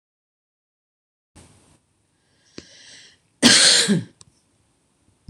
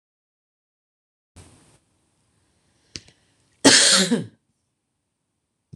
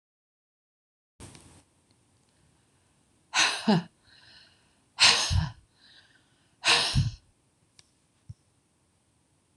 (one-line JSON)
{"three_cough_length": "5.3 s", "three_cough_amplitude": 26028, "three_cough_signal_mean_std_ratio": 0.27, "cough_length": "5.8 s", "cough_amplitude": 26027, "cough_signal_mean_std_ratio": 0.24, "exhalation_length": "9.6 s", "exhalation_amplitude": 17548, "exhalation_signal_mean_std_ratio": 0.3, "survey_phase": "beta (2021-08-13 to 2022-03-07)", "age": "45-64", "gender": "Female", "wearing_mask": "No", "symptom_shortness_of_breath": true, "symptom_fatigue": true, "symptom_onset": "12 days", "smoker_status": "Never smoked", "respiratory_condition_asthma": false, "respiratory_condition_other": true, "recruitment_source": "REACT", "submission_delay": "2 days", "covid_test_result": "Negative", "covid_test_method": "RT-qPCR"}